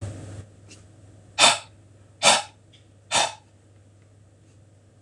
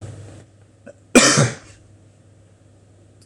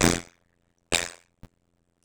{"exhalation_length": "5.0 s", "exhalation_amplitude": 25113, "exhalation_signal_mean_std_ratio": 0.31, "cough_length": "3.3 s", "cough_amplitude": 26028, "cough_signal_mean_std_ratio": 0.3, "three_cough_length": "2.0 s", "three_cough_amplitude": 24128, "three_cough_signal_mean_std_ratio": 0.16, "survey_phase": "beta (2021-08-13 to 2022-03-07)", "age": "45-64", "gender": "Male", "wearing_mask": "No", "symptom_runny_or_blocked_nose": true, "symptom_sore_throat": true, "smoker_status": "Never smoked", "respiratory_condition_asthma": false, "respiratory_condition_other": false, "recruitment_source": "Test and Trace", "submission_delay": "1 day", "covid_test_result": "Positive", "covid_test_method": "LFT"}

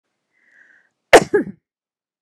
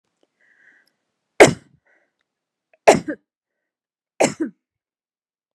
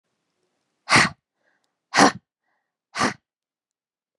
{"cough_length": "2.2 s", "cough_amplitude": 32768, "cough_signal_mean_std_ratio": 0.21, "three_cough_length": "5.5 s", "three_cough_amplitude": 32768, "three_cough_signal_mean_std_ratio": 0.19, "exhalation_length": "4.2 s", "exhalation_amplitude": 27281, "exhalation_signal_mean_std_ratio": 0.26, "survey_phase": "beta (2021-08-13 to 2022-03-07)", "age": "45-64", "gender": "Female", "wearing_mask": "No", "symptom_none": true, "smoker_status": "Ex-smoker", "respiratory_condition_asthma": false, "respiratory_condition_other": false, "recruitment_source": "REACT", "submission_delay": "2 days", "covid_test_result": "Negative", "covid_test_method": "RT-qPCR"}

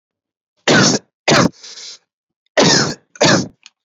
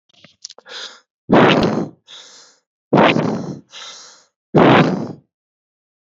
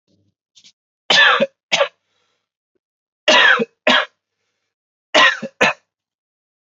{"cough_length": "3.8 s", "cough_amplitude": 32768, "cough_signal_mean_std_ratio": 0.47, "exhalation_length": "6.1 s", "exhalation_amplitude": 29875, "exhalation_signal_mean_std_ratio": 0.42, "three_cough_length": "6.7 s", "three_cough_amplitude": 30628, "three_cough_signal_mean_std_ratio": 0.37, "survey_phase": "beta (2021-08-13 to 2022-03-07)", "age": "18-44", "gender": "Male", "wearing_mask": "No", "symptom_runny_or_blocked_nose": true, "symptom_headache": true, "symptom_onset": "6 days", "smoker_status": "Current smoker (1 to 10 cigarettes per day)", "respiratory_condition_asthma": false, "respiratory_condition_other": false, "recruitment_source": "Test and Trace", "submission_delay": "1 day", "covid_test_result": "Positive", "covid_test_method": "RT-qPCR", "covid_ct_value": 16.4, "covid_ct_gene": "ORF1ab gene", "covid_ct_mean": 16.7, "covid_viral_load": "3400000 copies/ml", "covid_viral_load_category": "High viral load (>1M copies/ml)"}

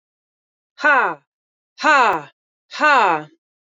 {"exhalation_length": "3.7 s", "exhalation_amplitude": 26922, "exhalation_signal_mean_std_ratio": 0.43, "survey_phase": "beta (2021-08-13 to 2022-03-07)", "age": "45-64", "gender": "Female", "wearing_mask": "Yes", "symptom_change_to_sense_of_smell_or_taste": true, "symptom_loss_of_taste": true, "symptom_other": true, "smoker_status": "Never smoked", "respiratory_condition_asthma": false, "respiratory_condition_other": false, "recruitment_source": "Test and Trace", "submission_delay": "2 days", "covid_test_result": "Positive", "covid_test_method": "RT-qPCR", "covid_ct_value": 15.4, "covid_ct_gene": "ORF1ab gene", "covid_ct_mean": 15.7, "covid_viral_load": "7100000 copies/ml", "covid_viral_load_category": "High viral load (>1M copies/ml)"}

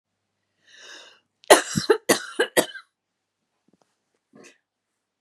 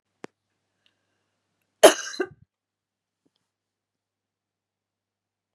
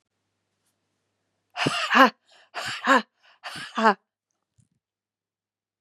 {"three_cough_length": "5.2 s", "three_cough_amplitude": 32767, "three_cough_signal_mean_std_ratio": 0.23, "cough_length": "5.5 s", "cough_amplitude": 32767, "cough_signal_mean_std_ratio": 0.12, "exhalation_length": "5.8 s", "exhalation_amplitude": 30956, "exhalation_signal_mean_std_ratio": 0.28, "survey_phase": "beta (2021-08-13 to 2022-03-07)", "age": "45-64", "gender": "Female", "wearing_mask": "No", "symptom_fatigue": true, "symptom_headache": true, "smoker_status": "Ex-smoker", "respiratory_condition_asthma": true, "respiratory_condition_other": false, "recruitment_source": "REACT", "submission_delay": "1 day", "covid_test_result": "Negative", "covid_test_method": "RT-qPCR", "influenza_a_test_result": "Negative", "influenza_b_test_result": "Negative"}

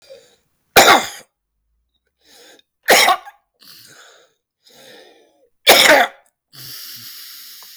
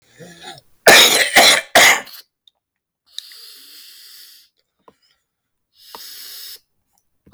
{"three_cough_length": "7.8 s", "three_cough_amplitude": 32768, "three_cough_signal_mean_std_ratio": 0.32, "cough_length": "7.3 s", "cough_amplitude": 32768, "cough_signal_mean_std_ratio": 0.32, "survey_phase": "beta (2021-08-13 to 2022-03-07)", "age": "45-64", "gender": "Male", "wearing_mask": "No", "symptom_none": true, "symptom_onset": "7 days", "smoker_status": "Never smoked", "respiratory_condition_asthma": true, "respiratory_condition_other": false, "recruitment_source": "REACT", "submission_delay": "1 day", "covid_test_result": "Negative", "covid_test_method": "RT-qPCR", "influenza_a_test_result": "Negative", "influenza_b_test_result": "Negative"}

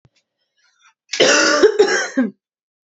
{"cough_length": "2.9 s", "cough_amplitude": 29372, "cough_signal_mean_std_ratio": 0.49, "survey_phase": "beta (2021-08-13 to 2022-03-07)", "age": "18-44", "gender": "Female", "wearing_mask": "No", "symptom_cough_any": true, "symptom_runny_or_blocked_nose": true, "symptom_sore_throat": true, "symptom_fatigue": true, "symptom_headache": true, "symptom_change_to_sense_of_smell_or_taste": true, "symptom_loss_of_taste": true, "symptom_onset": "4 days", "smoker_status": "Ex-smoker", "respiratory_condition_asthma": false, "respiratory_condition_other": false, "recruitment_source": "Test and Trace", "submission_delay": "2 days", "covid_test_result": "Positive", "covid_test_method": "RT-qPCR", "covid_ct_value": 14.7, "covid_ct_gene": "ORF1ab gene", "covid_ct_mean": 15.3, "covid_viral_load": "9800000 copies/ml", "covid_viral_load_category": "High viral load (>1M copies/ml)"}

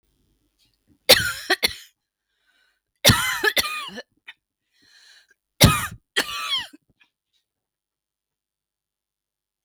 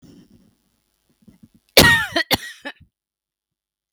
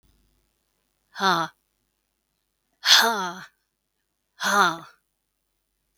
{"three_cough_length": "9.6 s", "three_cough_amplitude": 32768, "three_cough_signal_mean_std_ratio": 0.28, "cough_length": "3.9 s", "cough_amplitude": 32768, "cough_signal_mean_std_ratio": 0.27, "exhalation_length": "6.0 s", "exhalation_amplitude": 32768, "exhalation_signal_mean_std_ratio": 0.31, "survey_phase": "beta (2021-08-13 to 2022-03-07)", "age": "45-64", "gender": "Female", "wearing_mask": "No", "symptom_runny_or_blocked_nose": true, "symptom_shortness_of_breath": true, "symptom_fatigue": true, "smoker_status": "Ex-smoker", "respiratory_condition_asthma": true, "respiratory_condition_other": false, "recruitment_source": "REACT", "submission_delay": "2 days", "covid_test_result": "Negative", "covid_test_method": "RT-qPCR", "influenza_a_test_result": "Negative", "influenza_b_test_result": "Negative"}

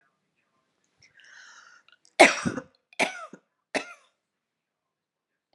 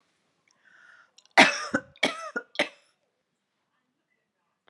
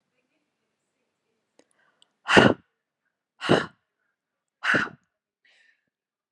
{"three_cough_length": "5.5 s", "three_cough_amplitude": 28736, "three_cough_signal_mean_std_ratio": 0.19, "cough_length": "4.7 s", "cough_amplitude": 28039, "cough_signal_mean_std_ratio": 0.23, "exhalation_length": "6.3 s", "exhalation_amplitude": 30618, "exhalation_signal_mean_std_ratio": 0.23, "survey_phase": "beta (2021-08-13 to 2022-03-07)", "age": "18-44", "gender": "Female", "wearing_mask": "No", "symptom_none": true, "smoker_status": "Never smoked", "respiratory_condition_asthma": false, "respiratory_condition_other": false, "recruitment_source": "REACT", "submission_delay": "1 day", "covid_test_result": "Negative", "covid_test_method": "RT-qPCR", "influenza_a_test_result": "Negative", "influenza_b_test_result": "Negative"}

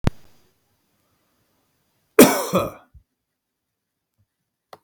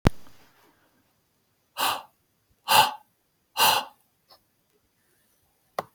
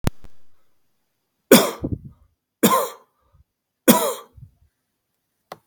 {"cough_length": "4.8 s", "cough_amplitude": 32768, "cough_signal_mean_std_ratio": 0.21, "exhalation_length": "5.9 s", "exhalation_amplitude": 32768, "exhalation_signal_mean_std_ratio": 0.28, "three_cough_length": "5.7 s", "three_cough_amplitude": 32768, "three_cough_signal_mean_std_ratio": 0.3, "survey_phase": "beta (2021-08-13 to 2022-03-07)", "age": "45-64", "gender": "Male", "wearing_mask": "No", "symptom_none": true, "smoker_status": "Never smoked", "respiratory_condition_asthma": false, "respiratory_condition_other": false, "recruitment_source": "REACT", "submission_delay": "1 day", "covid_test_result": "Negative", "covid_test_method": "RT-qPCR", "influenza_a_test_result": "Negative", "influenza_b_test_result": "Negative"}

